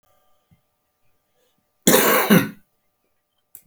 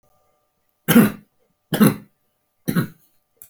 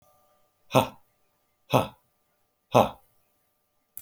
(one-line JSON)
{"cough_length": "3.7 s", "cough_amplitude": 30850, "cough_signal_mean_std_ratio": 0.32, "three_cough_length": "3.5 s", "three_cough_amplitude": 31089, "three_cough_signal_mean_std_ratio": 0.31, "exhalation_length": "4.0 s", "exhalation_amplitude": 24706, "exhalation_signal_mean_std_ratio": 0.22, "survey_phase": "beta (2021-08-13 to 2022-03-07)", "age": "65+", "gender": "Male", "wearing_mask": "No", "symptom_none": true, "smoker_status": "Never smoked", "respiratory_condition_asthma": false, "respiratory_condition_other": false, "recruitment_source": "REACT", "submission_delay": "4 days", "covid_test_result": "Negative", "covid_test_method": "RT-qPCR"}